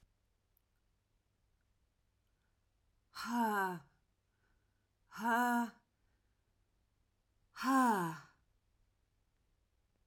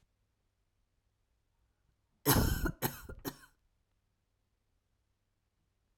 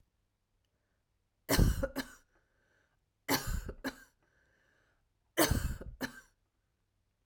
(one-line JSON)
{"exhalation_length": "10.1 s", "exhalation_amplitude": 2686, "exhalation_signal_mean_std_ratio": 0.34, "cough_length": "6.0 s", "cough_amplitude": 6854, "cough_signal_mean_std_ratio": 0.25, "three_cough_length": "7.3 s", "three_cough_amplitude": 6251, "three_cough_signal_mean_std_ratio": 0.32, "survey_phase": "beta (2021-08-13 to 2022-03-07)", "age": "45-64", "gender": "Female", "wearing_mask": "No", "symptom_cough_any": true, "symptom_shortness_of_breath": true, "symptom_sore_throat": true, "symptom_fatigue": true, "symptom_fever_high_temperature": true, "symptom_onset": "4 days", "smoker_status": "Never smoked", "respiratory_condition_asthma": false, "respiratory_condition_other": false, "recruitment_source": "Test and Trace", "submission_delay": "1 day", "covid_test_result": "Positive", "covid_test_method": "RT-qPCR", "covid_ct_value": 15.9, "covid_ct_gene": "N gene"}